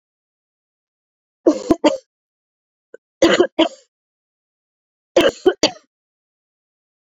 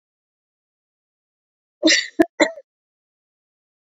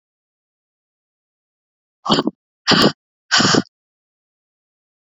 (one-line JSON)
{"three_cough_length": "7.2 s", "three_cough_amplitude": 32767, "three_cough_signal_mean_std_ratio": 0.27, "cough_length": "3.8 s", "cough_amplitude": 26911, "cough_signal_mean_std_ratio": 0.23, "exhalation_length": "5.1 s", "exhalation_amplitude": 30556, "exhalation_signal_mean_std_ratio": 0.29, "survey_phase": "beta (2021-08-13 to 2022-03-07)", "age": "18-44", "gender": "Female", "wearing_mask": "No", "symptom_cough_any": true, "symptom_runny_or_blocked_nose": true, "symptom_shortness_of_breath": true, "symptom_fatigue": true, "symptom_headache": true, "symptom_change_to_sense_of_smell_or_taste": true, "symptom_loss_of_taste": true, "smoker_status": "Ex-smoker", "respiratory_condition_asthma": false, "respiratory_condition_other": false, "recruitment_source": "Test and Trace", "submission_delay": "2 days", "covid_test_result": "Positive", "covid_test_method": "ePCR"}